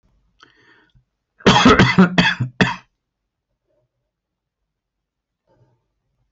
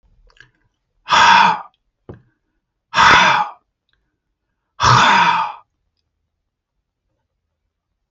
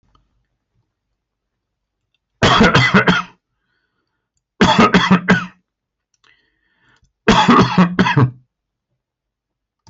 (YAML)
cough_length: 6.3 s
cough_amplitude: 32767
cough_signal_mean_std_ratio: 0.31
exhalation_length: 8.1 s
exhalation_amplitude: 29290
exhalation_signal_mean_std_ratio: 0.38
three_cough_length: 9.9 s
three_cough_amplitude: 30916
three_cough_signal_mean_std_ratio: 0.4
survey_phase: beta (2021-08-13 to 2022-03-07)
age: 65+
gender: Male
wearing_mask: 'No'
symptom_none: true
symptom_onset: 5 days
smoker_status: Never smoked
respiratory_condition_asthma: false
respiratory_condition_other: false
recruitment_source: REACT
submission_delay: 0 days
covid_test_result: Negative
covid_test_method: RT-qPCR